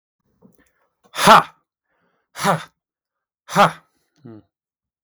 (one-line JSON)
{"exhalation_length": "5.0 s", "exhalation_amplitude": 32766, "exhalation_signal_mean_std_ratio": 0.25, "survey_phase": "beta (2021-08-13 to 2022-03-07)", "age": "18-44", "gender": "Male", "wearing_mask": "No", "symptom_none": true, "smoker_status": "Never smoked", "respiratory_condition_asthma": false, "respiratory_condition_other": false, "recruitment_source": "REACT", "submission_delay": "0 days", "covid_test_result": "Negative", "covid_test_method": "RT-qPCR", "influenza_a_test_result": "Negative", "influenza_b_test_result": "Negative"}